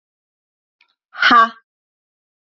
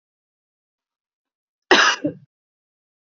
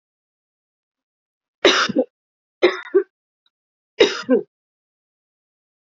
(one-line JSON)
{"exhalation_length": "2.6 s", "exhalation_amplitude": 28044, "exhalation_signal_mean_std_ratio": 0.27, "cough_length": "3.1 s", "cough_amplitude": 28435, "cough_signal_mean_std_ratio": 0.24, "three_cough_length": "5.8 s", "three_cough_amplitude": 31114, "three_cough_signal_mean_std_ratio": 0.29, "survey_phase": "alpha (2021-03-01 to 2021-08-12)", "age": "45-64", "gender": "Female", "wearing_mask": "No", "symptom_none": true, "smoker_status": "Never smoked", "respiratory_condition_asthma": false, "respiratory_condition_other": false, "recruitment_source": "REACT", "submission_delay": "5 days", "covid_test_result": "Negative", "covid_test_method": "RT-qPCR"}